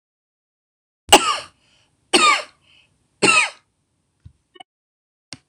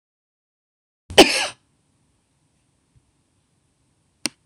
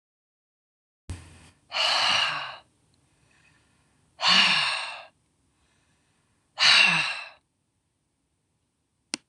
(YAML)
three_cough_length: 5.5 s
three_cough_amplitude: 26028
three_cough_signal_mean_std_ratio: 0.28
cough_length: 4.5 s
cough_amplitude: 26028
cough_signal_mean_std_ratio: 0.17
exhalation_length: 9.3 s
exhalation_amplitude: 18868
exhalation_signal_mean_std_ratio: 0.37
survey_phase: beta (2021-08-13 to 2022-03-07)
age: 65+
gender: Female
wearing_mask: 'No'
symptom_none: true
smoker_status: Never smoked
respiratory_condition_asthma: false
respiratory_condition_other: false
recruitment_source: Test and Trace
submission_delay: -1 day
covid_test_result: Negative
covid_test_method: LFT